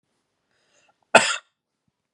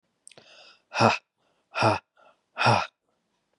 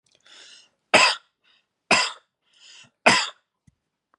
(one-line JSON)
{"cough_length": "2.1 s", "cough_amplitude": 32768, "cough_signal_mean_std_ratio": 0.19, "exhalation_length": "3.6 s", "exhalation_amplitude": 18880, "exhalation_signal_mean_std_ratio": 0.34, "three_cough_length": "4.2 s", "three_cough_amplitude": 32767, "three_cough_signal_mean_std_ratio": 0.29, "survey_phase": "beta (2021-08-13 to 2022-03-07)", "age": "18-44", "gender": "Male", "wearing_mask": "No", "symptom_cough_any": true, "symptom_sore_throat": true, "symptom_fatigue": true, "symptom_onset": "7 days", "smoker_status": "Never smoked", "respiratory_condition_asthma": false, "respiratory_condition_other": false, "recruitment_source": "Test and Trace", "submission_delay": "4 days", "covid_test_result": "Negative", "covid_test_method": "RT-qPCR"}